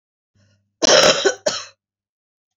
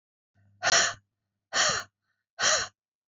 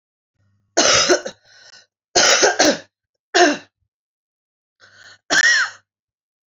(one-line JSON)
{"cough_length": "2.6 s", "cough_amplitude": 30509, "cough_signal_mean_std_ratio": 0.37, "exhalation_length": "3.1 s", "exhalation_amplitude": 12170, "exhalation_signal_mean_std_ratio": 0.42, "three_cough_length": "6.5 s", "three_cough_amplitude": 32767, "three_cough_signal_mean_std_ratio": 0.42, "survey_phase": "beta (2021-08-13 to 2022-03-07)", "age": "45-64", "gender": "Female", "wearing_mask": "No", "symptom_cough_any": true, "symptom_onset": "3 days", "smoker_status": "Never smoked", "respiratory_condition_asthma": false, "respiratory_condition_other": false, "recruitment_source": "Test and Trace", "submission_delay": "2 days", "covid_test_result": "Positive", "covid_test_method": "RT-qPCR", "covid_ct_value": 19.4, "covid_ct_gene": "ORF1ab gene", "covid_ct_mean": 19.6, "covid_viral_load": "360000 copies/ml", "covid_viral_load_category": "Low viral load (10K-1M copies/ml)"}